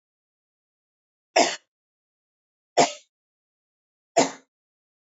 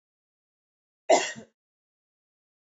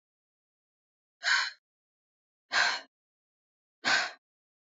{"three_cough_length": "5.1 s", "three_cough_amplitude": 21544, "three_cough_signal_mean_std_ratio": 0.21, "cough_length": "2.6 s", "cough_amplitude": 16305, "cough_signal_mean_std_ratio": 0.2, "exhalation_length": "4.8 s", "exhalation_amplitude": 7726, "exhalation_signal_mean_std_ratio": 0.31, "survey_phase": "beta (2021-08-13 to 2022-03-07)", "age": "18-44", "gender": "Female", "wearing_mask": "No", "symptom_none": true, "symptom_onset": "12 days", "smoker_status": "Never smoked", "respiratory_condition_asthma": true, "respiratory_condition_other": false, "recruitment_source": "REACT", "submission_delay": "3 days", "covid_test_result": "Negative", "covid_test_method": "RT-qPCR"}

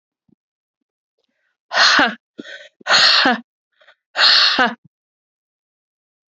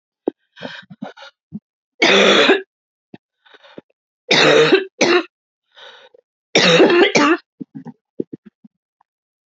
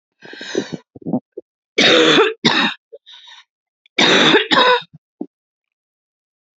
{"exhalation_length": "6.3 s", "exhalation_amplitude": 32768, "exhalation_signal_mean_std_ratio": 0.39, "three_cough_length": "9.5 s", "three_cough_amplitude": 32768, "three_cough_signal_mean_std_ratio": 0.42, "cough_length": "6.6 s", "cough_amplitude": 32767, "cough_signal_mean_std_ratio": 0.45, "survey_phase": "alpha (2021-03-01 to 2021-08-12)", "age": "18-44", "gender": "Female", "wearing_mask": "Yes", "symptom_new_continuous_cough": true, "symptom_shortness_of_breath": true, "symptom_fatigue": true, "symptom_headache": true, "smoker_status": "Never smoked", "respiratory_condition_asthma": false, "respiratory_condition_other": false, "recruitment_source": "Test and Trace", "submission_delay": "0 days", "covid_test_result": "Positive", "covid_test_method": "LFT"}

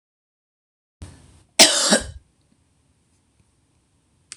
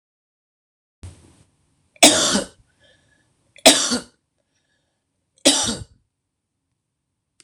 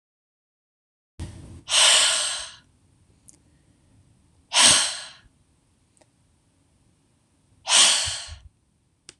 {"cough_length": "4.4 s", "cough_amplitude": 26028, "cough_signal_mean_std_ratio": 0.23, "three_cough_length": "7.4 s", "three_cough_amplitude": 26028, "three_cough_signal_mean_std_ratio": 0.26, "exhalation_length": "9.2 s", "exhalation_amplitude": 26028, "exhalation_signal_mean_std_ratio": 0.34, "survey_phase": "beta (2021-08-13 to 2022-03-07)", "age": "45-64", "gender": "Female", "wearing_mask": "No", "symptom_cough_any": true, "symptom_headache": true, "symptom_onset": "2 days", "smoker_status": "Ex-smoker", "respiratory_condition_asthma": false, "respiratory_condition_other": false, "recruitment_source": "Test and Trace", "submission_delay": "1 day", "covid_test_result": "Positive", "covid_test_method": "RT-qPCR", "covid_ct_value": 21.3, "covid_ct_gene": "ORF1ab gene", "covid_ct_mean": 21.6, "covid_viral_load": "84000 copies/ml", "covid_viral_load_category": "Low viral load (10K-1M copies/ml)"}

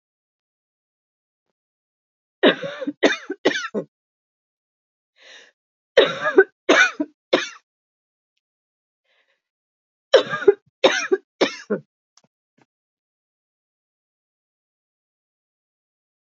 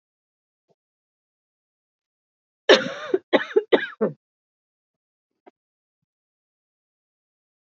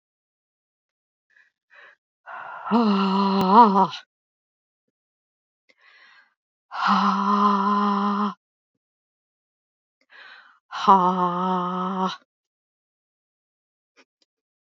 {"three_cough_length": "16.3 s", "three_cough_amplitude": 32767, "three_cough_signal_mean_std_ratio": 0.25, "cough_length": "7.7 s", "cough_amplitude": 28610, "cough_signal_mean_std_ratio": 0.2, "exhalation_length": "14.8 s", "exhalation_amplitude": 27841, "exhalation_signal_mean_std_ratio": 0.42, "survey_phase": "alpha (2021-03-01 to 2021-08-12)", "age": "45-64", "gender": "Female", "wearing_mask": "No", "symptom_cough_any": true, "symptom_shortness_of_breath": true, "symptom_fatigue": true, "symptom_headache": true, "symptom_onset": "12 days", "smoker_status": "Never smoked", "respiratory_condition_asthma": true, "respiratory_condition_other": false, "recruitment_source": "REACT", "submission_delay": "2 days", "covid_test_result": "Negative", "covid_test_method": "RT-qPCR"}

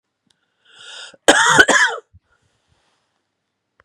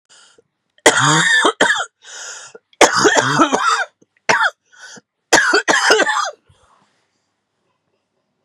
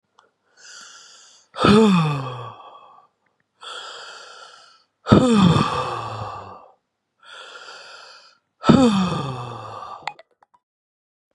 {"cough_length": "3.8 s", "cough_amplitude": 32768, "cough_signal_mean_std_ratio": 0.32, "three_cough_length": "8.4 s", "three_cough_amplitude": 32768, "three_cough_signal_mean_std_ratio": 0.5, "exhalation_length": "11.3 s", "exhalation_amplitude": 32767, "exhalation_signal_mean_std_ratio": 0.4, "survey_phase": "beta (2021-08-13 to 2022-03-07)", "age": "45-64", "gender": "Female", "wearing_mask": "No", "symptom_runny_or_blocked_nose": true, "symptom_sore_throat": true, "symptom_fatigue": true, "symptom_fever_high_temperature": true, "symptom_headache": true, "symptom_change_to_sense_of_smell_or_taste": true, "symptom_loss_of_taste": true, "symptom_onset": "2 days", "smoker_status": "Ex-smoker", "respiratory_condition_asthma": false, "respiratory_condition_other": false, "recruitment_source": "Test and Trace", "submission_delay": "2 days", "covid_test_result": "Positive", "covid_test_method": "ePCR"}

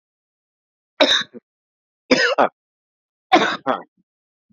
{"three_cough_length": "4.5 s", "three_cough_amplitude": 32767, "three_cough_signal_mean_std_ratio": 0.34, "survey_phase": "beta (2021-08-13 to 2022-03-07)", "age": "45-64", "gender": "Male", "wearing_mask": "No", "symptom_cough_any": true, "symptom_new_continuous_cough": true, "symptom_runny_or_blocked_nose": true, "symptom_sore_throat": true, "symptom_abdominal_pain": true, "symptom_fever_high_temperature": true, "symptom_headache": true, "smoker_status": "Ex-smoker", "respiratory_condition_asthma": false, "respiratory_condition_other": false, "recruitment_source": "Test and Trace", "submission_delay": "0 days", "covid_test_result": "Positive", "covid_test_method": "LFT"}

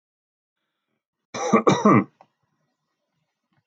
{"cough_length": "3.7 s", "cough_amplitude": 21964, "cough_signal_mean_std_ratio": 0.29, "survey_phase": "alpha (2021-03-01 to 2021-08-12)", "age": "65+", "gender": "Male", "wearing_mask": "No", "symptom_none": true, "smoker_status": "Never smoked", "respiratory_condition_asthma": false, "respiratory_condition_other": false, "recruitment_source": "REACT", "submission_delay": "1 day", "covid_test_result": "Negative", "covid_test_method": "RT-qPCR"}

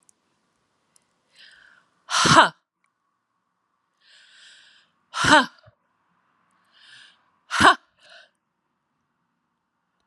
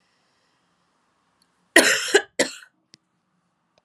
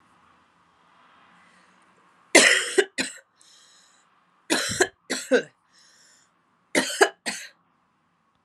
{"exhalation_length": "10.1 s", "exhalation_amplitude": 31596, "exhalation_signal_mean_std_ratio": 0.22, "cough_length": "3.8 s", "cough_amplitude": 32767, "cough_signal_mean_std_ratio": 0.25, "three_cough_length": "8.4 s", "three_cough_amplitude": 32702, "three_cough_signal_mean_std_ratio": 0.29, "survey_phase": "beta (2021-08-13 to 2022-03-07)", "age": "45-64", "gender": "Female", "wearing_mask": "No", "symptom_cough_any": true, "symptom_runny_or_blocked_nose": true, "symptom_sore_throat": true, "symptom_fatigue": true, "symptom_fever_high_temperature": true, "smoker_status": "Never smoked", "respiratory_condition_asthma": false, "respiratory_condition_other": false, "recruitment_source": "Test and Trace", "submission_delay": "2 days", "covid_test_result": "Positive", "covid_test_method": "RT-qPCR", "covid_ct_value": 23.2, "covid_ct_gene": "ORF1ab gene", "covid_ct_mean": 25.6, "covid_viral_load": "3900 copies/ml", "covid_viral_load_category": "Minimal viral load (< 10K copies/ml)"}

